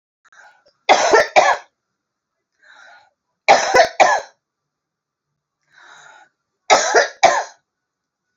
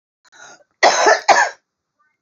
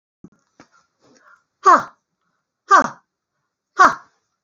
{"three_cough_length": "8.4 s", "three_cough_amplitude": 29549, "three_cough_signal_mean_std_ratio": 0.35, "cough_length": "2.2 s", "cough_amplitude": 32379, "cough_signal_mean_std_ratio": 0.41, "exhalation_length": "4.4 s", "exhalation_amplitude": 32768, "exhalation_signal_mean_std_ratio": 0.26, "survey_phase": "beta (2021-08-13 to 2022-03-07)", "age": "65+", "gender": "Female", "wearing_mask": "No", "symptom_none": true, "smoker_status": "Ex-smoker", "respiratory_condition_asthma": false, "respiratory_condition_other": true, "recruitment_source": "REACT", "submission_delay": "2 days", "covid_test_result": "Negative", "covid_test_method": "RT-qPCR", "influenza_a_test_result": "Negative", "influenza_b_test_result": "Negative"}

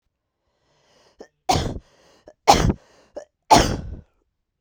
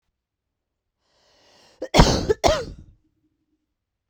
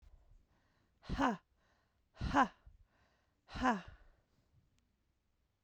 {"three_cough_length": "4.6 s", "three_cough_amplitude": 32768, "three_cough_signal_mean_std_ratio": 0.3, "cough_length": "4.1 s", "cough_amplitude": 32768, "cough_signal_mean_std_ratio": 0.28, "exhalation_length": "5.6 s", "exhalation_amplitude": 4041, "exhalation_signal_mean_std_ratio": 0.29, "survey_phase": "beta (2021-08-13 to 2022-03-07)", "age": "18-44", "gender": "Female", "wearing_mask": "No", "symptom_cough_any": true, "symptom_runny_or_blocked_nose": true, "symptom_sore_throat": true, "symptom_fatigue": true, "symptom_headache": true, "smoker_status": "Never smoked", "respiratory_condition_asthma": false, "respiratory_condition_other": false, "recruitment_source": "Test and Trace", "submission_delay": "0 days", "covid_test_result": "Positive", "covid_test_method": "LFT"}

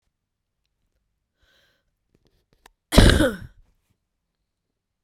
{"cough_length": "5.0 s", "cough_amplitude": 32768, "cough_signal_mean_std_ratio": 0.21, "survey_phase": "beta (2021-08-13 to 2022-03-07)", "age": "18-44", "gender": "Female", "wearing_mask": "No", "symptom_cough_any": true, "symptom_runny_or_blocked_nose": true, "symptom_shortness_of_breath": true, "symptom_sore_throat": true, "symptom_diarrhoea": true, "symptom_fatigue": true, "symptom_fever_high_temperature": true, "symptom_headache": true, "smoker_status": "Never smoked", "respiratory_condition_asthma": false, "respiratory_condition_other": true, "recruitment_source": "Test and Trace", "submission_delay": "2 days", "covid_test_result": "Positive", "covid_test_method": "RT-qPCR", "covid_ct_value": 25.6, "covid_ct_gene": "N gene"}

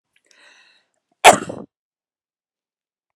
{"cough_length": "3.2 s", "cough_amplitude": 32768, "cough_signal_mean_std_ratio": 0.17, "survey_phase": "beta (2021-08-13 to 2022-03-07)", "age": "45-64", "gender": "Female", "wearing_mask": "No", "symptom_none": true, "smoker_status": "Never smoked", "respiratory_condition_asthma": false, "respiratory_condition_other": false, "recruitment_source": "REACT", "submission_delay": "1 day", "covid_test_result": "Negative", "covid_test_method": "RT-qPCR"}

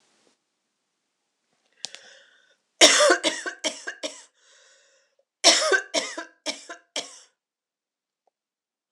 {"cough_length": "8.9 s", "cough_amplitude": 26028, "cough_signal_mean_std_ratio": 0.29, "survey_phase": "alpha (2021-03-01 to 2021-08-12)", "age": "45-64", "gender": "Female", "wearing_mask": "No", "symptom_cough_any": true, "symptom_fatigue": true, "symptom_headache": true, "smoker_status": "Never smoked", "respiratory_condition_asthma": false, "respiratory_condition_other": false, "recruitment_source": "Test and Trace", "submission_delay": "1 day", "covid_test_result": "Positive", "covid_test_method": "RT-qPCR", "covid_ct_value": 19.0, "covid_ct_gene": "ORF1ab gene"}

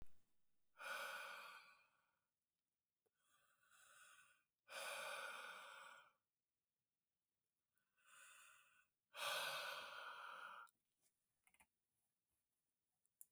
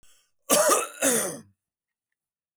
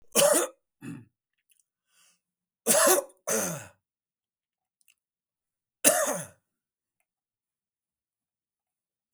{"exhalation_length": "13.3 s", "exhalation_amplitude": 685, "exhalation_signal_mean_std_ratio": 0.46, "cough_length": "2.6 s", "cough_amplitude": 19647, "cough_signal_mean_std_ratio": 0.43, "three_cough_length": "9.1 s", "three_cough_amplitude": 20560, "three_cough_signal_mean_std_ratio": 0.3, "survey_phase": "beta (2021-08-13 to 2022-03-07)", "age": "45-64", "gender": "Male", "wearing_mask": "No", "symptom_none": true, "symptom_onset": "5 days", "smoker_status": "Ex-smoker", "respiratory_condition_asthma": false, "respiratory_condition_other": false, "recruitment_source": "REACT", "submission_delay": "1 day", "covid_test_result": "Negative", "covid_test_method": "RT-qPCR"}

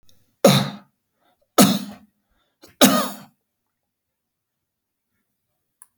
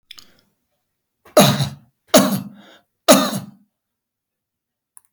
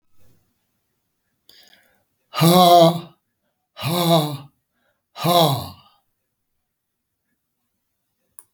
{"three_cough_length": "6.0 s", "three_cough_amplitude": 32768, "three_cough_signal_mean_std_ratio": 0.27, "cough_length": "5.1 s", "cough_amplitude": 32768, "cough_signal_mean_std_ratio": 0.31, "exhalation_length": "8.5 s", "exhalation_amplitude": 30025, "exhalation_signal_mean_std_ratio": 0.33, "survey_phase": "alpha (2021-03-01 to 2021-08-12)", "age": "65+", "gender": "Male", "wearing_mask": "No", "symptom_none": true, "smoker_status": "Ex-smoker", "respiratory_condition_asthma": false, "respiratory_condition_other": false, "recruitment_source": "REACT", "submission_delay": "1 day", "covid_test_result": "Negative", "covid_test_method": "RT-qPCR"}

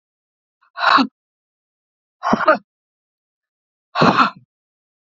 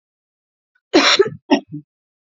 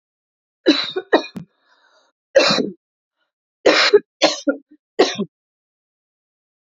{"exhalation_length": "5.1 s", "exhalation_amplitude": 32767, "exhalation_signal_mean_std_ratio": 0.32, "cough_length": "2.3 s", "cough_amplitude": 28994, "cough_signal_mean_std_ratio": 0.34, "three_cough_length": "6.7 s", "three_cough_amplitude": 29733, "three_cough_signal_mean_std_ratio": 0.35, "survey_phase": "beta (2021-08-13 to 2022-03-07)", "age": "45-64", "gender": "Female", "wearing_mask": "No", "symptom_cough_any": true, "symptom_runny_or_blocked_nose": true, "symptom_headache": true, "smoker_status": "Ex-smoker", "respiratory_condition_asthma": false, "respiratory_condition_other": false, "recruitment_source": "Test and Trace", "submission_delay": "1 day", "covid_test_result": "Positive", "covid_test_method": "RT-qPCR", "covid_ct_value": 22.8, "covid_ct_gene": "N gene", "covid_ct_mean": 23.0, "covid_viral_load": "29000 copies/ml", "covid_viral_load_category": "Low viral load (10K-1M copies/ml)"}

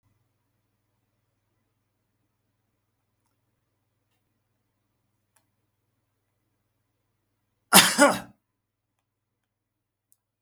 {"cough_length": "10.4 s", "cough_amplitude": 32768, "cough_signal_mean_std_ratio": 0.14, "survey_phase": "beta (2021-08-13 to 2022-03-07)", "age": "65+", "gender": "Male", "wearing_mask": "No", "symptom_none": true, "smoker_status": "Never smoked", "respiratory_condition_asthma": false, "respiratory_condition_other": false, "recruitment_source": "REACT", "submission_delay": "1 day", "covid_test_result": "Negative", "covid_test_method": "RT-qPCR", "influenza_a_test_result": "Negative", "influenza_b_test_result": "Negative"}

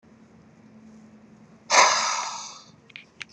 {"exhalation_length": "3.3 s", "exhalation_amplitude": 25986, "exhalation_signal_mean_std_ratio": 0.36, "survey_phase": "beta (2021-08-13 to 2022-03-07)", "age": "18-44", "gender": "Male", "wearing_mask": "No", "symptom_shortness_of_breath": true, "smoker_status": "Ex-smoker", "respiratory_condition_asthma": false, "respiratory_condition_other": false, "recruitment_source": "REACT", "submission_delay": "4 days", "covid_test_result": "Negative", "covid_test_method": "RT-qPCR"}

